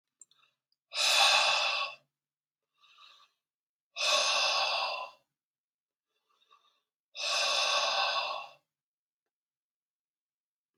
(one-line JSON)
{"exhalation_length": "10.8 s", "exhalation_amplitude": 9298, "exhalation_signal_mean_std_ratio": 0.46, "survey_phase": "beta (2021-08-13 to 2022-03-07)", "age": "45-64", "gender": "Male", "wearing_mask": "No", "symptom_cough_any": true, "symptom_runny_or_blocked_nose": true, "symptom_fatigue": true, "symptom_onset": "6 days", "smoker_status": "Never smoked", "respiratory_condition_asthma": false, "respiratory_condition_other": false, "recruitment_source": "Test and Trace", "submission_delay": "1 day", "covid_test_result": "Positive", "covid_test_method": "RT-qPCR", "covid_ct_value": 18.3, "covid_ct_gene": "ORF1ab gene", "covid_ct_mean": 18.8, "covid_viral_load": "690000 copies/ml", "covid_viral_load_category": "Low viral load (10K-1M copies/ml)"}